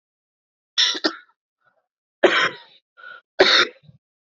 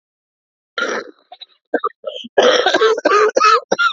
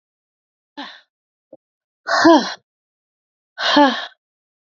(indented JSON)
{
  "three_cough_length": "4.3 s",
  "three_cough_amplitude": 28062,
  "three_cough_signal_mean_std_ratio": 0.34,
  "cough_length": "3.9 s",
  "cough_amplitude": 32768,
  "cough_signal_mean_std_ratio": 0.56,
  "exhalation_length": "4.6 s",
  "exhalation_amplitude": 28278,
  "exhalation_signal_mean_std_ratio": 0.32,
  "survey_phase": "beta (2021-08-13 to 2022-03-07)",
  "age": "45-64",
  "gender": "Female",
  "wearing_mask": "No",
  "symptom_cough_any": true,
  "symptom_new_continuous_cough": true,
  "symptom_runny_or_blocked_nose": true,
  "symptom_shortness_of_breath": true,
  "symptom_abdominal_pain": true,
  "symptom_diarrhoea": true,
  "symptom_fatigue": true,
  "symptom_fever_high_temperature": true,
  "symptom_headache": true,
  "symptom_onset": "5 days",
  "smoker_status": "Never smoked",
  "recruitment_source": "Test and Trace",
  "submission_delay": "2 days",
  "covid_test_result": "Positive",
  "covid_test_method": "LAMP"
}